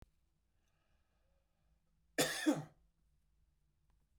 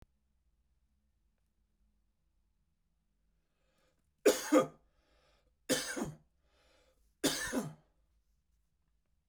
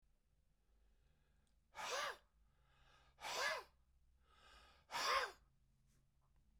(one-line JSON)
{"cough_length": "4.2 s", "cough_amplitude": 3228, "cough_signal_mean_std_ratio": 0.24, "three_cough_length": "9.3 s", "three_cough_amplitude": 6024, "three_cough_signal_mean_std_ratio": 0.24, "exhalation_length": "6.6 s", "exhalation_amplitude": 1423, "exhalation_signal_mean_std_ratio": 0.37, "survey_phase": "beta (2021-08-13 to 2022-03-07)", "age": "65+", "gender": "Male", "wearing_mask": "No", "symptom_none": true, "smoker_status": "Ex-smoker", "respiratory_condition_asthma": false, "respiratory_condition_other": false, "recruitment_source": "REACT", "submission_delay": "2 days", "covid_test_result": "Negative", "covid_test_method": "RT-qPCR"}